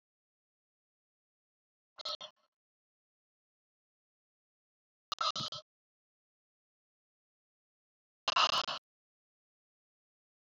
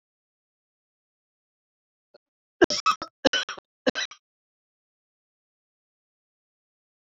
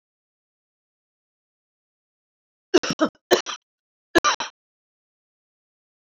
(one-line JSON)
{"exhalation_length": "10.4 s", "exhalation_amplitude": 5269, "exhalation_signal_mean_std_ratio": 0.2, "cough_length": "7.1 s", "cough_amplitude": 21961, "cough_signal_mean_std_ratio": 0.18, "three_cough_length": "6.1 s", "three_cough_amplitude": 26218, "three_cough_signal_mean_std_ratio": 0.2, "survey_phase": "alpha (2021-03-01 to 2021-08-12)", "age": "45-64", "gender": "Female", "wearing_mask": "No", "symptom_none": true, "smoker_status": "Ex-smoker", "respiratory_condition_asthma": false, "respiratory_condition_other": false, "recruitment_source": "REACT", "submission_delay": "15 days", "covid_test_result": "Negative", "covid_test_method": "RT-qPCR"}